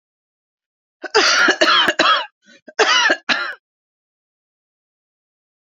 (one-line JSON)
{"cough_length": "5.7 s", "cough_amplitude": 28390, "cough_signal_mean_std_ratio": 0.43, "survey_phase": "beta (2021-08-13 to 2022-03-07)", "age": "65+", "gender": "Male", "wearing_mask": "No", "symptom_fatigue": true, "symptom_headache": true, "symptom_change_to_sense_of_smell_or_taste": true, "symptom_loss_of_taste": true, "symptom_onset": "3 days", "smoker_status": "Never smoked", "respiratory_condition_asthma": false, "respiratory_condition_other": false, "recruitment_source": "Test and Trace", "submission_delay": "1 day", "covid_test_result": "Positive", "covid_test_method": "RT-qPCR", "covid_ct_value": 17.0, "covid_ct_gene": "ORF1ab gene", "covid_ct_mean": 18.0, "covid_viral_load": "1200000 copies/ml", "covid_viral_load_category": "High viral load (>1M copies/ml)"}